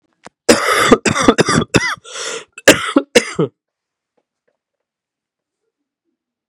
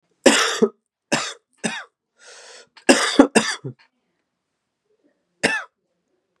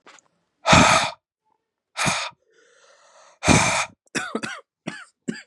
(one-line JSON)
{"cough_length": "6.5 s", "cough_amplitude": 32768, "cough_signal_mean_std_ratio": 0.37, "three_cough_length": "6.4 s", "three_cough_amplitude": 32768, "three_cough_signal_mean_std_ratio": 0.32, "exhalation_length": "5.5 s", "exhalation_amplitude": 29032, "exhalation_signal_mean_std_ratio": 0.39, "survey_phase": "beta (2021-08-13 to 2022-03-07)", "age": "18-44", "gender": "Male", "wearing_mask": "No", "symptom_cough_any": true, "symptom_runny_or_blocked_nose": true, "symptom_shortness_of_breath": true, "symptom_fatigue": true, "symptom_fever_high_temperature": true, "symptom_headache": true, "symptom_loss_of_taste": true, "symptom_onset": "4 days", "smoker_status": "Never smoked", "respiratory_condition_asthma": false, "respiratory_condition_other": false, "recruitment_source": "Test and Trace", "submission_delay": "2 days", "covid_test_result": "Positive", "covid_test_method": "ePCR"}